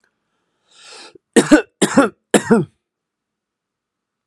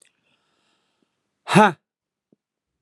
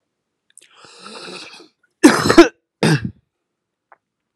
three_cough_length: 4.3 s
three_cough_amplitude: 32768
three_cough_signal_mean_std_ratio: 0.3
exhalation_length: 2.8 s
exhalation_amplitude: 31775
exhalation_signal_mean_std_ratio: 0.2
cough_length: 4.4 s
cough_amplitude: 32768
cough_signal_mean_std_ratio: 0.28
survey_phase: alpha (2021-03-01 to 2021-08-12)
age: 18-44
gender: Male
wearing_mask: 'No'
symptom_none: true
symptom_onset: 5 days
smoker_status: Current smoker (1 to 10 cigarettes per day)
respiratory_condition_asthma: false
respiratory_condition_other: false
recruitment_source: Test and Trace
submission_delay: 2 days
covid_test_method: RT-qPCR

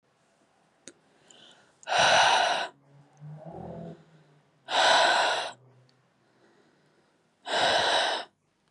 exhalation_length: 8.7 s
exhalation_amplitude: 13351
exhalation_signal_mean_std_ratio: 0.46
survey_phase: beta (2021-08-13 to 2022-03-07)
age: 18-44
gender: Female
wearing_mask: 'No'
symptom_headache: true
smoker_status: Never smoked
respiratory_condition_asthma: false
respiratory_condition_other: false
recruitment_source: REACT
submission_delay: 3 days
covid_test_result: Negative
covid_test_method: RT-qPCR
influenza_a_test_result: Negative
influenza_b_test_result: Negative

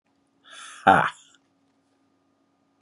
exhalation_length: 2.8 s
exhalation_amplitude: 24848
exhalation_signal_mean_std_ratio: 0.22
survey_phase: beta (2021-08-13 to 2022-03-07)
age: 45-64
gender: Male
wearing_mask: 'No'
symptom_none: true
symptom_onset: 6 days
smoker_status: Never smoked
respiratory_condition_asthma: false
respiratory_condition_other: false
recruitment_source: REACT
submission_delay: 2 days
covid_test_result: Negative
covid_test_method: RT-qPCR
influenza_a_test_result: Negative
influenza_b_test_result: Negative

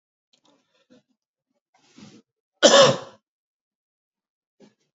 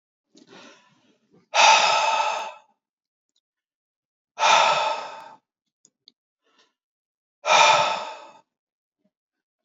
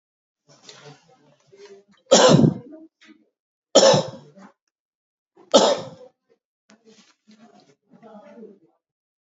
cough_length: 4.9 s
cough_amplitude: 29590
cough_signal_mean_std_ratio: 0.21
exhalation_length: 9.6 s
exhalation_amplitude: 25614
exhalation_signal_mean_std_ratio: 0.37
three_cough_length: 9.4 s
three_cough_amplitude: 29120
three_cough_signal_mean_std_ratio: 0.27
survey_phase: beta (2021-08-13 to 2022-03-07)
age: 45-64
gender: Male
wearing_mask: 'Yes'
symptom_none: true
smoker_status: Never smoked
respiratory_condition_asthma: false
respiratory_condition_other: false
recruitment_source: REACT
submission_delay: 2 days
covid_test_result: Negative
covid_test_method: RT-qPCR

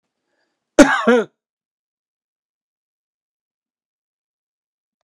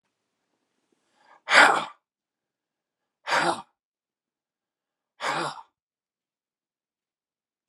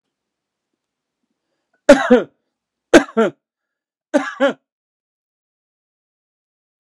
cough_length: 5.0 s
cough_amplitude: 32768
cough_signal_mean_std_ratio: 0.2
exhalation_length: 7.7 s
exhalation_amplitude: 25945
exhalation_signal_mean_std_ratio: 0.23
three_cough_length: 6.8 s
three_cough_amplitude: 32768
three_cough_signal_mean_std_ratio: 0.23
survey_phase: beta (2021-08-13 to 2022-03-07)
age: 65+
gender: Male
wearing_mask: 'No'
symptom_none: true
smoker_status: Never smoked
respiratory_condition_asthma: false
respiratory_condition_other: false
recruitment_source: REACT
submission_delay: 2 days
covid_test_result: Negative
covid_test_method: RT-qPCR
influenza_a_test_result: Negative
influenza_b_test_result: Negative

